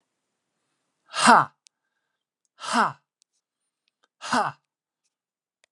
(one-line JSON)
{"exhalation_length": "5.7 s", "exhalation_amplitude": 28646, "exhalation_signal_mean_std_ratio": 0.24, "survey_phase": "beta (2021-08-13 to 2022-03-07)", "age": "45-64", "gender": "Male", "wearing_mask": "No", "symptom_none": true, "smoker_status": "Never smoked", "respiratory_condition_asthma": false, "respiratory_condition_other": false, "recruitment_source": "REACT", "submission_delay": "3 days", "covid_test_result": "Negative", "covid_test_method": "RT-qPCR"}